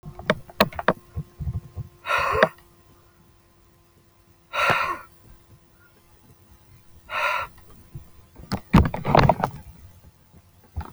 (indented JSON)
{
  "exhalation_length": "10.9 s",
  "exhalation_amplitude": 31549,
  "exhalation_signal_mean_std_ratio": 0.36,
  "survey_phase": "alpha (2021-03-01 to 2021-08-12)",
  "age": "45-64",
  "gender": "Male",
  "wearing_mask": "No",
  "symptom_none": true,
  "smoker_status": "Never smoked",
  "respiratory_condition_asthma": false,
  "respiratory_condition_other": false,
  "recruitment_source": "REACT",
  "submission_delay": "2 days",
  "covid_test_result": "Negative",
  "covid_test_method": "RT-qPCR"
}